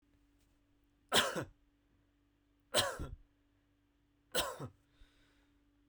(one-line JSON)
{"three_cough_length": "5.9 s", "three_cough_amplitude": 5085, "three_cough_signal_mean_std_ratio": 0.29, "survey_phase": "beta (2021-08-13 to 2022-03-07)", "age": "18-44", "gender": "Male", "wearing_mask": "No", "symptom_cough_any": true, "smoker_status": "Never smoked", "respiratory_condition_asthma": false, "respiratory_condition_other": false, "recruitment_source": "REACT", "submission_delay": "1 day", "covid_test_result": "Negative", "covid_test_method": "RT-qPCR"}